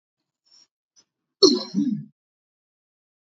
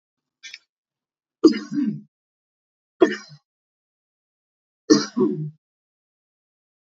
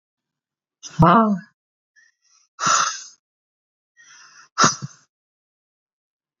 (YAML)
cough_length: 3.3 s
cough_amplitude: 27165
cough_signal_mean_std_ratio: 0.26
three_cough_length: 6.9 s
three_cough_amplitude: 29019
three_cough_signal_mean_std_ratio: 0.26
exhalation_length: 6.4 s
exhalation_amplitude: 30280
exhalation_signal_mean_std_ratio: 0.3
survey_phase: beta (2021-08-13 to 2022-03-07)
age: 45-64
gender: Female
wearing_mask: 'No'
symptom_shortness_of_breath: true
symptom_sore_throat: true
smoker_status: Never smoked
respiratory_condition_asthma: false
respiratory_condition_other: false
recruitment_source: REACT
submission_delay: 1 day
covid_test_result: Negative
covid_test_method: RT-qPCR